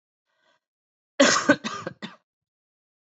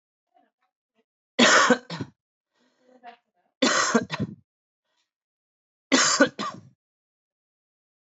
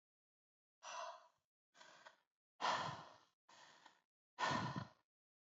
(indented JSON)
{
  "cough_length": "3.1 s",
  "cough_amplitude": 19770,
  "cough_signal_mean_std_ratio": 0.28,
  "three_cough_length": "8.0 s",
  "three_cough_amplitude": 20217,
  "three_cough_signal_mean_std_ratio": 0.32,
  "exhalation_length": "5.5 s",
  "exhalation_amplitude": 1666,
  "exhalation_signal_mean_std_ratio": 0.37,
  "survey_phase": "beta (2021-08-13 to 2022-03-07)",
  "age": "18-44",
  "gender": "Male",
  "wearing_mask": "No",
  "symptom_cough_any": true,
  "symptom_onset": "4 days",
  "smoker_status": "Ex-smoker",
  "respiratory_condition_asthma": false,
  "respiratory_condition_other": false,
  "recruitment_source": "REACT",
  "submission_delay": "0 days",
  "covid_test_result": "Negative",
  "covid_test_method": "RT-qPCR"
}